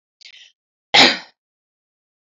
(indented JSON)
{
  "cough_length": "2.3 s",
  "cough_amplitude": 31067,
  "cough_signal_mean_std_ratio": 0.24,
  "survey_phase": "alpha (2021-03-01 to 2021-08-12)",
  "age": "18-44",
  "gender": "Female",
  "wearing_mask": "No",
  "symptom_none": true,
  "smoker_status": "Never smoked",
  "respiratory_condition_asthma": false,
  "respiratory_condition_other": false,
  "recruitment_source": "Test and Trace",
  "submission_delay": "2 days",
  "covid_test_result": "Positive",
  "covid_test_method": "RT-qPCR",
  "covid_ct_value": 17.8,
  "covid_ct_gene": "ORF1ab gene",
  "covid_ct_mean": 18.3,
  "covid_viral_load": "1000000 copies/ml",
  "covid_viral_load_category": "High viral load (>1M copies/ml)"
}